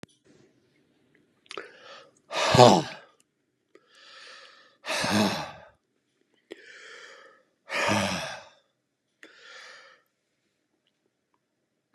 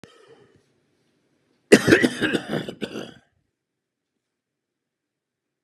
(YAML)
exhalation_length: 11.9 s
exhalation_amplitude: 28916
exhalation_signal_mean_std_ratio: 0.27
cough_length: 5.6 s
cough_amplitude: 32767
cough_signal_mean_std_ratio: 0.25
survey_phase: beta (2021-08-13 to 2022-03-07)
age: 65+
gender: Male
wearing_mask: 'No'
symptom_none: true
smoker_status: Ex-smoker
respiratory_condition_asthma: false
respiratory_condition_other: false
recruitment_source: REACT
submission_delay: 1 day
covid_test_result: Negative
covid_test_method: RT-qPCR
influenza_a_test_result: Negative
influenza_b_test_result: Negative